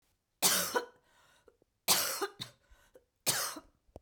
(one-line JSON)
{"cough_length": "4.0 s", "cough_amplitude": 8587, "cough_signal_mean_std_ratio": 0.4, "survey_phase": "beta (2021-08-13 to 2022-03-07)", "age": "45-64", "gender": "Female", "wearing_mask": "No", "symptom_cough_any": true, "symptom_new_continuous_cough": true, "symptom_runny_or_blocked_nose": true, "symptom_shortness_of_breath": true, "symptom_fatigue": true, "symptom_onset": "4 days", "smoker_status": "Ex-smoker", "respiratory_condition_asthma": true, "respiratory_condition_other": false, "recruitment_source": "Test and Trace", "submission_delay": "1 day", "covid_test_result": "Negative", "covid_test_method": "RT-qPCR"}